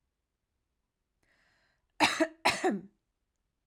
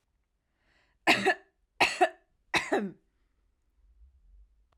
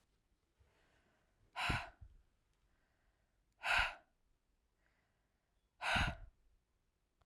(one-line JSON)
{"cough_length": "3.7 s", "cough_amplitude": 15251, "cough_signal_mean_std_ratio": 0.29, "three_cough_length": "4.8 s", "three_cough_amplitude": 11130, "three_cough_signal_mean_std_ratio": 0.31, "exhalation_length": "7.3 s", "exhalation_amplitude": 2764, "exhalation_signal_mean_std_ratio": 0.3, "survey_phase": "alpha (2021-03-01 to 2021-08-12)", "age": "18-44", "gender": "Female", "wearing_mask": "No", "symptom_none": true, "smoker_status": "Never smoked", "respiratory_condition_asthma": false, "respiratory_condition_other": false, "recruitment_source": "REACT", "submission_delay": "1 day", "covid_test_result": "Negative", "covid_test_method": "RT-qPCR"}